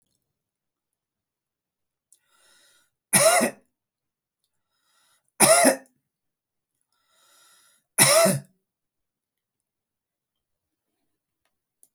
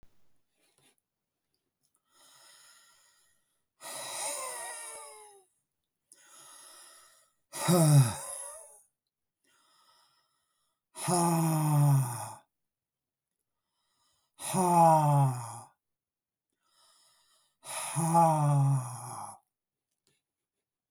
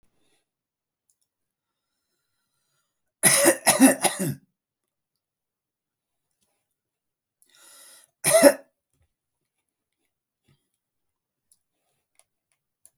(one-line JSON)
{"three_cough_length": "11.9 s", "three_cough_amplitude": 28428, "three_cough_signal_mean_std_ratio": 0.25, "exhalation_length": "20.9 s", "exhalation_amplitude": 8899, "exhalation_signal_mean_std_ratio": 0.39, "cough_length": "13.0 s", "cough_amplitude": 29289, "cough_signal_mean_std_ratio": 0.22, "survey_phase": "beta (2021-08-13 to 2022-03-07)", "age": "65+", "gender": "Male", "wearing_mask": "No", "symptom_none": true, "smoker_status": "Ex-smoker", "respiratory_condition_asthma": true, "respiratory_condition_other": false, "recruitment_source": "REACT", "submission_delay": "0 days", "covid_test_result": "Negative", "covid_test_method": "RT-qPCR", "influenza_a_test_result": "Negative", "influenza_b_test_result": "Negative"}